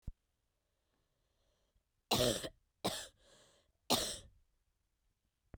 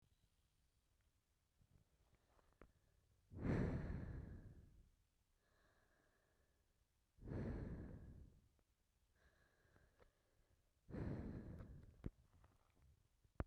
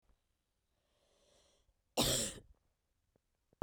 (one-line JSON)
{"three_cough_length": "5.6 s", "three_cough_amplitude": 5165, "three_cough_signal_mean_std_ratio": 0.29, "exhalation_length": "13.5 s", "exhalation_amplitude": 1363, "exhalation_signal_mean_std_ratio": 0.39, "cough_length": "3.6 s", "cough_amplitude": 4036, "cough_signal_mean_std_ratio": 0.26, "survey_phase": "beta (2021-08-13 to 2022-03-07)", "age": "18-44", "gender": "Female", "wearing_mask": "No", "symptom_cough_any": true, "symptom_runny_or_blocked_nose": true, "symptom_shortness_of_breath": true, "symptom_fatigue": true, "symptom_fever_high_temperature": true, "symptom_headache": true, "symptom_onset": "3 days", "smoker_status": "Ex-smoker", "respiratory_condition_asthma": false, "respiratory_condition_other": false, "recruitment_source": "Test and Trace", "submission_delay": "2 days", "covid_test_result": "Positive", "covid_test_method": "RT-qPCR", "covid_ct_value": 15.4, "covid_ct_gene": "ORF1ab gene", "covid_ct_mean": 15.4, "covid_viral_load": "8800000 copies/ml", "covid_viral_load_category": "High viral load (>1M copies/ml)"}